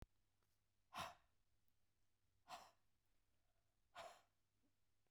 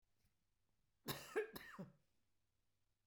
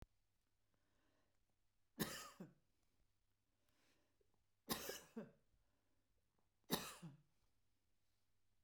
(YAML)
exhalation_length: 5.1 s
exhalation_amplitude: 403
exhalation_signal_mean_std_ratio: 0.35
cough_length: 3.1 s
cough_amplitude: 1013
cough_signal_mean_std_ratio: 0.32
three_cough_length: 8.6 s
three_cough_amplitude: 1688
three_cough_signal_mean_std_ratio: 0.29
survey_phase: beta (2021-08-13 to 2022-03-07)
age: 65+
gender: Female
wearing_mask: 'No'
symptom_runny_or_blocked_nose: true
smoker_status: Never smoked
respiratory_condition_asthma: false
respiratory_condition_other: false
recruitment_source: REACT
submission_delay: 3 days
covid_test_result: Negative
covid_test_method: RT-qPCR
influenza_a_test_result: Negative
influenza_b_test_result: Negative